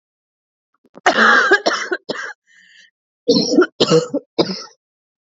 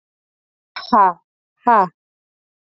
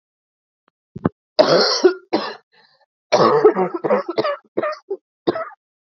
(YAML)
cough_length: 5.2 s
cough_amplitude: 29014
cough_signal_mean_std_ratio: 0.46
exhalation_length: 2.6 s
exhalation_amplitude: 27600
exhalation_signal_mean_std_ratio: 0.32
three_cough_length: 5.8 s
three_cough_amplitude: 30819
three_cough_signal_mean_std_ratio: 0.46
survey_phase: beta (2021-08-13 to 2022-03-07)
age: 18-44
gender: Female
wearing_mask: 'No'
symptom_cough_any: true
symptom_new_continuous_cough: true
symptom_runny_or_blocked_nose: true
symptom_sore_throat: true
symptom_abdominal_pain: true
symptom_fatigue: true
symptom_headache: true
symptom_change_to_sense_of_smell_or_taste: true
symptom_loss_of_taste: true
symptom_onset: 2 days
smoker_status: Current smoker (11 or more cigarettes per day)
respiratory_condition_asthma: false
respiratory_condition_other: false
recruitment_source: Test and Trace
submission_delay: 1 day
covid_test_result: Positive
covid_test_method: RT-qPCR
covid_ct_value: 21.1
covid_ct_gene: ORF1ab gene